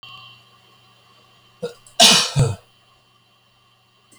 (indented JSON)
{
  "cough_length": "4.2 s",
  "cough_amplitude": 32768,
  "cough_signal_mean_std_ratio": 0.29,
  "survey_phase": "beta (2021-08-13 to 2022-03-07)",
  "age": "65+",
  "gender": "Male",
  "wearing_mask": "No",
  "symptom_none": true,
  "smoker_status": "Never smoked",
  "respiratory_condition_asthma": false,
  "respiratory_condition_other": false,
  "recruitment_source": "REACT",
  "submission_delay": "2 days",
  "covid_test_result": "Negative",
  "covid_test_method": "RT-qPCR"
}